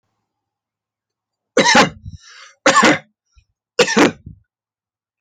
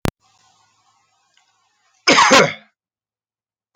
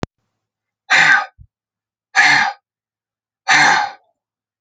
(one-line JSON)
{"three_cough_length": "5.2 s", "three_cough_amplitude": 32686, "three_cough_signal_mean_std_ratio": 0.35, "cough_length": "3.8 s", "cough_amplitude": 32687, "cough_signal_mean_std_ratio": 0.28, "exhalation_length": "4.6 s", "exhalation_amplitude": 30888, "exhalation_signal_mean_std_ratio": 0.41, "survey_phase": "beta (2021-08-13 to 2022-03-07)", "age": "45-64", "gender": "Male", "wearing_mask": "No", "symptom_none": true, "smoker_status": "Never smoked", "respiratory_condition_asthma": false, "respiratory_condition_other": false, "recruitment_source": "Test and Trace", "submission_delay": "0 days", "covid_test_result": "Negative", "covid_test_method": "LFT"}